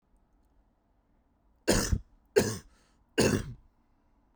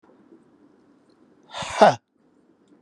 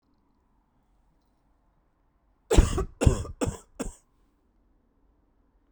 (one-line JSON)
{"three_cough_length": "4.4 s", "three_cough_amplitude": 11286, "three_cough_signal_mean_std_ratio": 0.32, "exhalation_length": "2.8 s", "exhalation_amplitude": 31516, "exhalation_signal_mean_std_ratio": 0.22, "cough_length": "5.7 s", "cough_amplitude": 22104, "cough_signal_mean_std_ratio": 0.24, "survey_phase": "beta (2021-08-13 to 2022-03-07)", "age": "18-44", "gender": "Male", "wearing_mask": "No", "symptom_none": true, "smoker_status": "Ex-smoker", "respiratory_condition_asthma": false, "respiratory_condition_other": false, "recruitment_source": "REACT", "submission_delay": "1 day", "covid_test_result": "Negative", "covid_test_method": "RT-qPCR"}